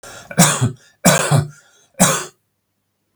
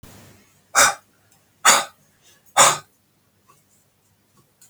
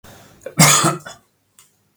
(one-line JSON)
{"three_cough_length": "3.2 s", "three_cough_amplitude": 32768, "three_cough_signal_mean_std_ratio": 0.45, "exhalation_length": "4.7 s", "exhalation_amplitude": 32768, "exhalation_signal_mean_std_ratio": 0.28, "cough_length": "2.0 s", "cough_amplitude": 32768, "cough_signal_mean_std_ratio": 0.37, "survey_phase": "beta (2021-08-13 to 2022-03-07)", "age": "45-64", "gender": "Male", "wearing_mask": "No", "symptom_cough_any": true, "symptom_shortness_of_breath": true, "symptom_sore_throat": true, "symptom_onset": "12 days", "smoker_status": "Never smoked", "respiratory_condition_asthma": false, "respiratory_condition_other": false, "recruitment_source": "REACT", "submission_delay": "2 days", "covid_test_result": "Positive", "covid_test_method": "RT-qPCR", "covid_ct_value": 32.9, "covid_ct_gene": "E gene", "influenza_a_test_result": "Negative", "influenza_b_test_result": "Negative"}